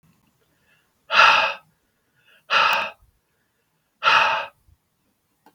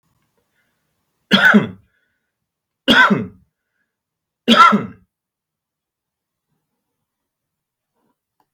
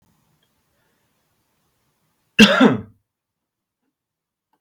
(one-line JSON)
{"exhalation_length": "5.5 s", "exhalation_amplitude": 32412, "exhalation_signal_mean_std_ratio": 0.36, "three_cough_length": "8.5 s", "three_cough_amplitude": 32768, "three_cough_signal_mean_std_ratio": 0.27, "cough_length": "4.6 s", "cough_amplitude": 32768, "cough_signal_mean_std_ratio": 0.21, "survey_phase": "beta (2021-08-13 to 2022-03-07)", "age": "45-64", "gender": "Male", "wearing_mask": "No", "symptom_change_to_sense_of_smell_or_taste": true, "symptom_loss_of_taste": true, "symptom_onset": "12 days", "smoker_status": "Current smoker (e-cigarettes or vapes only)", "respiratory_condition_asthma": false, "respiratory_condition_other": false, "recruitment_source": "Test and Trace", "submission_delay": "2 days", "covid_test_result": "Positive", "covid_test_method": "RT-qPCR", "covid_ct_value": 24.2, "covid_ct_gene": "N gene", "covid_ct_mean": 25.3, "covid_viral_load": "5100 copies/ml", "covid_viral_load_category": "Minimal viral load (< 10K copies/ml)"}